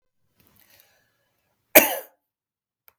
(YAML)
cough_length: 3.0 s
cough_amplitude: 32768
cough_signal_mean_std_ratio: 0.16
survey_phase: beta (2021-08-13 to 2022-03-07)
age: 45-64
gender: Male
wearing_mask: 'No'
symptom_none: true
smoker_status: Ex-smoker
respiratory_condition_asthma: false
respiratory_condition_other: false
recruitment_source: REACT
submission_delay: 1 day
covid_test_result: Negative
covid_test_method: RT-qPCR
influenza_a_test_result: Negative
influenza_b_test_result: Negative